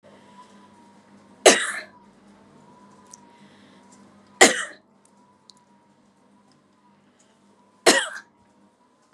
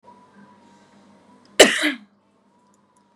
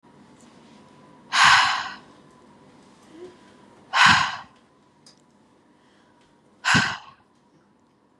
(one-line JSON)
{"three_cough_length": "9.1 s", "three_cough_amplitude": 32768, "three_cough_signal_mean_std_ratio": 0.21, "cough_length": "3.2 s", "cough_amplitude": 32768, "cough_signal_mean_std_ratio": 0.22, "exhalation_length": "8.2 s", "exhalation_amplitude": 31070, "exhalation_signal_mean_std_ratio": 0.32, "survey_phase": "beta (2021-08-13 to 2022-03-07)", "age": "18-44", "gender": "Female", "wearing_mask": "No", "symptom_none": true, "smoker_status": "Ex-smoker", "respiratory_condition_asthma": true, "respiratory_condition_other": false, "recruitment_source": "REACT", "submission_delay": "0 days", "covid_test_result": "Negative", "covid_test_method": "RT-qPCR", "influenza_a_test_result": "Negative", "influenza_b_test_result": "Negative"}